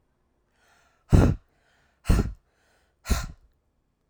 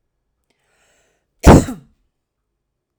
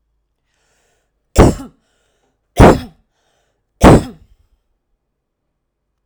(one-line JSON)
{"exhalation_length": "4.1 s", "exhalation_amplitude": 22653, "exhalation_signal_mean_std_ratio": 0.28, "cough_length": "3.0 s", "cough_amplitude": 32768, "cough_signal_mean_std_ratio": 0.21, "three_cough_length": "6.1 s", "three_cough_amplitude": 32768, "three_cough_signal_mean_std_ratio": 0.26, "survey_phase": "alpha (2021-03-01 to 2021-08-12)", "age": "45-64", "gender": "Female", "wearing_mask": "No", "symptom_none": true, "smoker_status": "Ex-smoker", "respiratory_condition_asthma": false, "respiratory_condition_other": false, "recruitment_source": "REACT", "submission_delay": "2 days", "covid_test_result": "Negative", "covid_test_method": "RT-qPCR"}